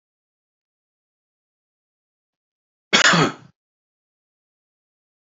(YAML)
cough_length: 5.4 s
cough_amplitude: 32768
cough_signal_mean_std_ratio: 0.2
survey_phase: beta (2021-08-13 to 2022-03-07)
age: 45-64
gender: Male
wearing_mask: 'No'
symptom_none: true
smoker_status: Never smoked
respiratory_condition_asthma: false
respiratory_condition_other: false
recruitment_source: REACT
submission_delay: 1 day
covid_test_result: Negative
covid_test_method: RT-qPCR
influenza_a_test_result: Negative
influenza_b_test_result: Negative